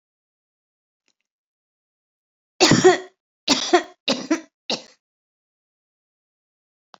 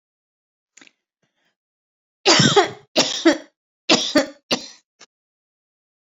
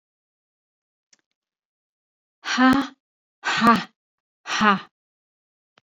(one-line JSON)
{"cough_length": "7.0 s", "cough_amplitude": 28615, "cough_signal_mean_std_ratio": 0.26, "three_cough_length": "6.1 s", "three_cough_amplitude": 30149, "three_cough_signal_mean_std_ratio": 0.32, "exhalation_length": "5.9 s", "exhalation_amplitude": 23595, "exhalation_signal_mean_std_ratio": 0.32, "survey_phase": "beta (2021-08-13 to 2022-03-07)", "age": "65+", "gender": "Female", "wearing_mask": "No", "symptom_none": true, "smoker_status": "Never smoked", "respiratory_condition_asthma": false, "respiratory_condition_other": false, "recruitment_source": "REACT", "submission_delay": "2 days", "covid_test_result": "Negative", "covid_test_method": "RT-qPCR"}